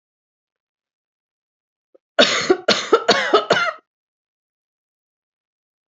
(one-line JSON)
{"three_cough_length": "6.0 s", "three_cough_amplitude": 29847, "three_cough_signal_mean_std_ratio": 0.32, "survey_phase": "beta (2021-08-13 to 2022-03-07)", "age": "18-44", "gender": "Female", "wearing_mask": "No", "symptom_runny_or_blocked_nose": true, "smoker_status": "Never smoked", "respiratory_condition_asthma": false, "respiratory_condition_other": false, "recruitment_source": "Test and Trace", "submission_delay": "1 day", "covid_test_result": "Positive", "covid_test_method": "RT-qPCR", "covid_ct_value": 23.7, "covid_ct_gene": "ORF1ab gene", "covid_ct_mean": 24.6, "covid_viral_load": "8300 copies/ml", "covid_viral_load_category": "Minimal viral load (< 10K copies/ml)"}